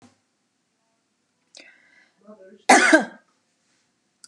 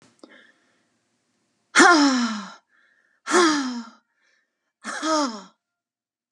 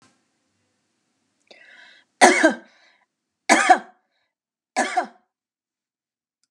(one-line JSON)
{"cough_length": "4.3 s", "cough_amplitude": 29745, "cough_signal_mean_std_ratio": 0.23, "exhalation_length": "6.3 s", "exhalation_amplitude": 29919, "exhalation_signal_mean_std_ratio": 0.38, "three_cough_length": "6.5 s", "three_cough_amplitude": 32767, "three_cough_signal_mean_std_ratio": 0.26, "survey_phase": "beta (2021-08-13 to 2022-03-07)", "age": "65+", "gender": "Female", "wearing_mask": "No", "symptom_none": true, "smoker_status": "Never smoked", "respiratory_condition_asthma": false, "respiratory_condition_other": false, "recruitment_source": "REACT", "submission_delay": "6 days", "covid_test_result": "Negative", "covid_test_method": "RT-qPCR", "influenza_a_test_result": "Negative", "influenza_b_test_result": "Negative"}